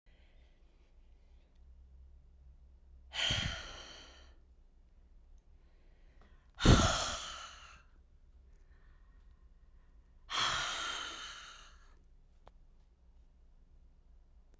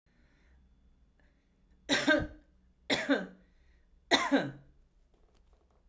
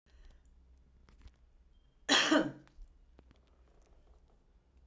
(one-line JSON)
{"exhalation_length": "14.6 s", "exhalation_amplitude": 8547, "exhalation_signal_mean_std_ratio": 0.31, "three_cough_length": "5.9 s", "three_cough_amplitude": 9443, "three_cough_signal_mean_std_ratio": 0.34, "cough_length": "4.9 s", "cough_amplitude": 6722, "cough_signal_mean_std_ratio": 0.27, "survey_phase": "beta (2021-08-13 to 2022-03-07)", "age": "65+", "gender": "Female", "wearing_mask": "No", "symptom_none": true, "smoker_status": "Ex-smoker", "respiratory_condition_asthma": false, "respiratory_condition_other": false, "recruitment_source": "REACT", "submission_delay": "3 days", "covid_test_result": "Negative", "covid_test_method": "RT-qPCR"}